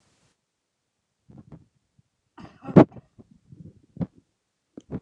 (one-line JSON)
{"cough_length": "5.0 s", "cough_amplitude": 29204, "cough_signal_mean_std_ratio": 0.14, "survey_phase": "beta (2021-08-13 to 2022-03-07)", "age": "65+", "gender": "Male", "wearing_mask": "No", "symptom_fatigue": true, "symptom_headache": true, "smoker_status": "Ex-smoker", "respiratory_condition_asthma": false, "respiratory_condition_other": false, "recruitment_source": "REACT", "submission_delay": "2 days", "covid_test_result": "Negative", "covid_test_method": "RT-qPCR", "influenza_a_test_result": "Unknown/Void", "influenza_b_test_result": "Unknown/Void"}